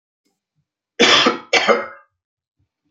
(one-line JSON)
{"cough_length": "2.9 s", "cough_amplitude": 31488, "cough_signal_mean_std_ratio": 0.38, "survey_phase": "beta (2021-08-13 to 2022-03-07)", "age": "65+", "gender": "Male", "wearing_mask": "No", "symptom_cough_any": true, "smoker_status": "Ex-smoker", "respiratory_condition_asthma": false, "respiratory_condition_other": false, "recruitment_source": "REACT", "submission_delay": "3 days", "covid_test_result": "Negative", "covid_test_method": "RT-qPCR", "influenza_a_test_result": "Negative", "influenza_b_test_result": "Negative"}